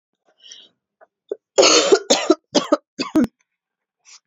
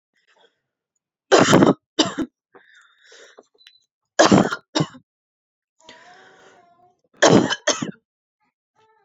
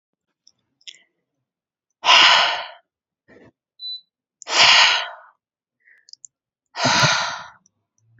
{"cough_length": "4.3 s", "cough_amplitude": 32767, "cough_signal_mean_std_ratio": 0.37, "three_cough_length": "9.0 s", "three_cough_amplitude": 32767, "three_cough_signal_mean_std_ratio": 0.3, "exhalation_length": "8.2 s", "exhalation_amplitude": 32767, "exhalation_signal_mean_std_ratio": 0.36, "survey_phase": "beta (2021-08-13 to 2022-03-07)", "age": "18-44", "gender": "Female", "wearing_mask": "No", "symptom_cough_any": true, "symptom_new_continuous_cough": true, "symptom_runny_or_blocked_nose": true, "symptom_shortness_of_breath": true, "symptom_sore_throat": true, "symptom_fatigue": true, "symptom_headache": true, "symptom_onset": "2 days", "smoker_status": "Ex-smoker", "respiratory_condition_asthma": false, "respiratory_condition_other": false, "recruitment_source": "Test and Trace", "submission_delay": "1 day", "covid_test_result": "Positive", "covid_test_method": "RT-qPCR", "covid_ct_value": 30.5, "covid_ct_gene": "ORF1ab gene"}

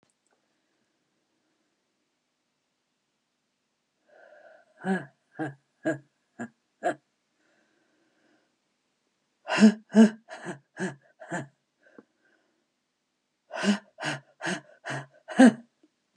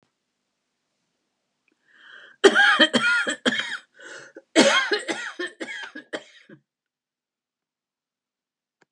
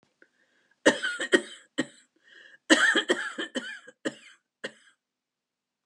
{"exhalation_length": "16.2 s", "exhalation_amplitude": 18719, "exhalation_signal_mean_std_ratio": 0.22, "three_cough_length": "8.9 s", "three_cough_amplitude": 29896, "three_cough_signal_mean_std_ratio": 0.35, "cough_length": "5.9 s", "cough_amplitude": 19626, "cough_signal_mean_std_ratio": 0.33, "survey_phase": "beta (2021-08-13 to 2022-03-07)", "age": "65+", "gender": "Female", "wearing_mask": "No", "symptom_cough_any": true, "smoker_status": "Ex-smoker", "respiratory_condition_asthma": false, "respiratory_condition_other": false, "recruitment_source": "REACT", "submission_delay": "15 days", "covid_test_result": "Negative", "covid_test_method": "RT-qPCR"}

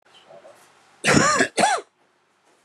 {"cough_length": "2.6 s", "cough_amplitude": 25347, "cough_signal_mean_std_ratio": 0.43, "survey_phase": "beta (2021-08-13 to 2022-03-07)", "age": "45-64", "gender": "Male", "wearing_mask": "No", "symptom_none": true, "smoker_status": "Never smoked", "respiratory_condition_asthma": false, "respiratory_condition_other": false, "recruitment_source": "REACT", "submission_delay": "1 day", "covid_test_result": "Negative", "covid_test_method": "RT-qPCR", "influenza_a_test_result": "Negative", "influenza_b_test_result": "Negative"}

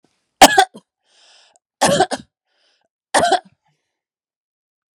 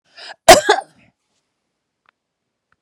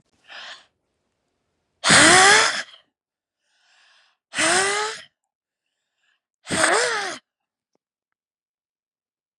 {"three_cough_length": "4.9 s", "three_cough_amplitude": 32768, "three_cough_signal_mean_std_ratio": 0.28, "cough_length": "2.8 s", "cough_amplitude": 32768, "cough_signal_mean_std_ratio": 0.22, "exhalation_length": "9.4 s", "exhalation_amplitude": 30697, "exhalation_signal_mean_std_ratio": 0.34, "survey_phase": "beta (2021-08-13 to 2022-03-07)", "age": "45-64", "gender": "Female", "wearing_mask": "No", "symptom_none": true, "smoker_status": "Current smoker (11 or more cigarettes per day)", "respiratory_condition_asthma": false, "respiratory_condition_other": false, "recruitment_source": "REACT", "submission_delay": "4 days", "covid_test_result": "Negative", "covid_test_method": "RT-qPCR"}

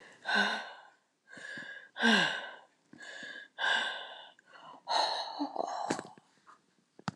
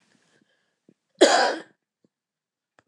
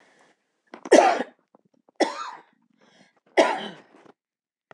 {"exhalation_length": "7.2 s", "exhalation_amplitude": 6509, "exhalation_signal_mean_std_ratio": 0.51, "cough_length": "2.9 s", "cough_amplitude": 24058, "cough_signal_mean_std_ratio": 0.26, "three_cough_length": "4.7 s", "three_cough_amplitude": 25864, "three_cough_signal_mean_std_ratio": 0.28, "survey_phase": "beta (2021-08-13 to 2022-03-07)", "age": "65+", "gender": "Female", "wearing_mask": "No", "symptom_none": true, "smoker_status": "Never smoked", "respiratory_condition_asthma": false, "respiratory_condition_other": false, "recruitment_source": "REACT", "submission_delay": "4 days", "covid_test_result": "Negative", "covid_test_method": "RT-qPCR"}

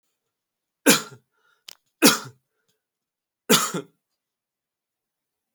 {"three_cough_length": "5.5 s", "three_cough_amplitude": 29194, "three_cough_signal_mean_std_ratio": 0.23, "survey_phase": "alpha (2021-03-01 to 2021-08-12)", "age": "18-44", "gender": "Male", "wearing_mask": "No", "symptom_none": true, "smoker_status": "Never smoked", "respiratory_condition_asthma": false, "respiratory_condition_other": false, "recruitment_source": "REACT", "submission_delay": "3 days", "covid_test_result": "Negative", "covid_test_method": "RT-qPCR"}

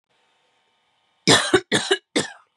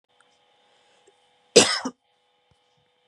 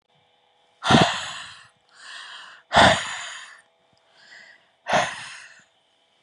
{"three_cough_length": "2.6 s", "three_cough_amplitude": 30606, "three_cough_signal_mean_std_ratio": 0.36, "cough_length": "3.1 s", "cough_amplitude": 32767, "cough_signal_mean_std_ratio": 0.2, "exhalation_length": "6.2 s", "exhalation_amplitude": 27786, "exhalation_signal_mean_std_ratio": 0.34, "survey_phase": "beta (2021-08-13 to 2022-03-07)", "age": "18-44", "gender": "Female", "wearing_mask": "No", "symptom_none": true, "smoker_status": "Never smoked", "respiratory_condition_asthma": false, "respiratory_condition_other": false, "recruitment_source": "REACT", "submission_delay": "3 days", "covid_test_result": "Negative", "covid_test_method": "RT-qPCR", "influenza_a_test_result": "Unknown/Void", "influenza_b_test_result": "Unknown/Void"}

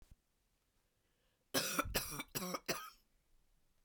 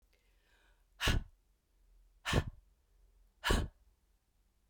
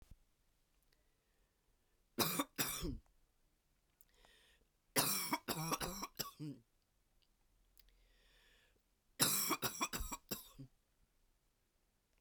{"cough_length": "3.8 s", "cough_amplitude": 3228, "cough_signal_mean_std_ratio": 0.4, "exhalation_length": "4.7 s", "exhalation_amplitude": 4385, "exhalation_signal_mean_std_ratio": 0.31, "three_cough_length": "12.2 s", "three_cough_amplitude": 4753, "three_cough_signal_mean_std_ratio": 0.37, "survey_phase": "beta (2021-08-13 to 2022-03-07)", "age": "45-64", "gender": "Female", "wearing_mask": "No", "symptom_cough_any": true, "symptom_runny_or_blocked_nose": true, "symptom_fatigue": true, "symptom_headache": true, "symptom_other": true, "smoker_status": "Ex-smoker", "respiratory_condition_asthma": false, "respiratory_condition_other": false, "recruitment_source": "Test and Trace", "submission_delay": "2 days", "covid_test_result": "Positive", "covid_test_method": "RT-qPCR", "covid_ct_value": 21.2, "covid_ct_gene": "ORF1ab gene"}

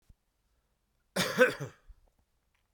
{"cough_length": "2.7 s", "cough_amplitude": 9613, "cough_signal_mean_std_ratio": 0.28, "survey_phase": "beta (2021-08-13 to 2022-03-07)", "age": "65+", "gender": "Male", "wearing_mask": "No", "symptom_cough_any": true, "symptom_runny_or_blocked_nose": true, "symptom_sore_throat": true, "symptom_fatigue": true, "symptom_headache": true, "symptom_onset": "5 days", "smoker_status": "Never smoked", "respiratory_condition_asthma": false, "respiratory_condition_other": false, "recruitment_source": "Test and Trace", "submission_delay": "2 days", "covid_test_result": "Positive", "covid_test_method": "RT-qPCR", "covid_ct_value": 16.0, "covid_ct_gene": "ORF1ab gene", "covid_ct_mean": 16.3, "covid_viral_load": "4600000 copies/ml", "covid_viral_load_category": "High viral load (>1M copies/ml)"}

